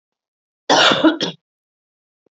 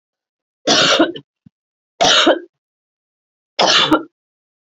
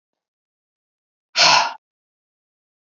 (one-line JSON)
{"cough_length": "2.3 s", "cough_amplitude": 32768, "cough_signal_mean_std_ratio": 0.38, "three_cough_length": "4.7 s", "three_cough_amplitude": 32767, "three_cough_signal_mean_std_ratio": 0.43, "exhalation_length": "2.8 s", "exhalation_amplitude": 31754, "exhalation_signal_mean_std_ratio": 0.27, "survey_phase": "beta (2021-08-13 to 2022-03-07)", "age": "45-64", "gender": "Female", "wearing_mask": "No", "symptom_cough_any": true, "symptom_runny_or_blocked_nose": true, "symptom_fatigue": true, "symptom_other": true, "symptom_onset": "12 days", "smoker_status": "Never smoked", "respiratory_condition_asthma": false, "respiratory_condition_other": false, "recruitment_source": "REACT", "submission_delay": "2 days", "covid_test_result": "Negative", "covid_test_method": "RT-qPCR"}